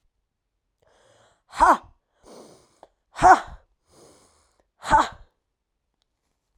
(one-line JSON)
{"exhalation_length": "6.6 s", "exhalation_amplitude": 27113, "exhalation_signal_mean_std_ratio": 0.23, "survey_phase": "alpha (2021-03-01 to 2021-08-12)", "age": "18-44", "gender": "Female", "wearing_mask": "No", "symptom_cough_any": true, "symptom_new_continuous_cough": true, "symptom_fatigue": true, "symptom_headache": true, "symptom_onset": "2 days", "smoker_status": "Never smoked", "respiratory_condition_asthma": true, "respiratory_condition_other": false, "recruitment_source": "Test and Trace", "submission_delay": "1 day", "covid_test_result": "Positive", "covid_test_method": "RT-qPCR", "covid_ct_value": 26.9, "covid_ct_gene": "ORF1ab gene", "covid_ct_mean": 27.8, "covid_viral_load": "790 copies/ml", "covid_viral_load_category": "Minimal viral load (< 10K copies/ml)"}